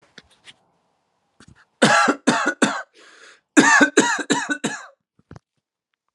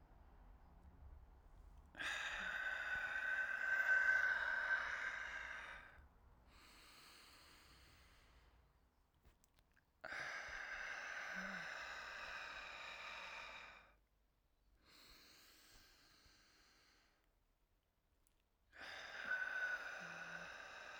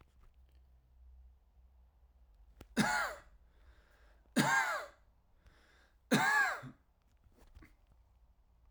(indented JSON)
{
  "cough_length": "6.1 s",
  "cough_amplitude": 32518,
  "cough_signal_mean_std_ratio": 0.4,
  "exhalation_length": "21.0 s",
  "exhalation_amplitude": 1713,
  "exhalation_signal_mean_std_ratio": 0.56,
  "three_cough_length": "8.7 s",
  "three_cough_amplitude": 5671,
  "three_cough_signal_mean_std_ratio": 0.35,
  "survey_phase": "alpha (2021-03-01 to 2021-08-12)",
  "age": "18-44",
  "gender": "Male",
  "wearing_mask": "No",
  "symptom_headache": true,
  "smoker_status": "Never smoked",
  "respiratory_condition_asthma": false,
  "respiratory_condition_other": false,
  "recruitment_source": "Test and Trace",
  "submission_delay": "2 days",
  "covid_test_result": "Positive",
  "covid_test_method": "RT-qPCR",
  "covid_ct_value": 19.5,
  "covid_ct_gene": "ORF1ab gene"
}